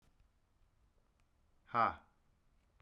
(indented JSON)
{
  "exhalation_length": "2.8 s",
  "exhalation_amplitude": 3885,
  "exhalation_signal_mean_std_ratio": 0.22,
  "survey_phase": "beta (2021-08-13 to 2022-03-07)",
  "age": "45-64",
  "gender": "Male",
  "wearing_mask": "No",
  "symptom_none": true,
  "smoker_status": "Ex-smoker",
  "respiratory_condition_asthma": false,
  "respiratory_condition_other": false,
  "recruitment_source": "REACT",
  "submission_delay": "1 day",
  "covid_test_result": "Negative",
  "covid_test_method": "RT-qPCR"
}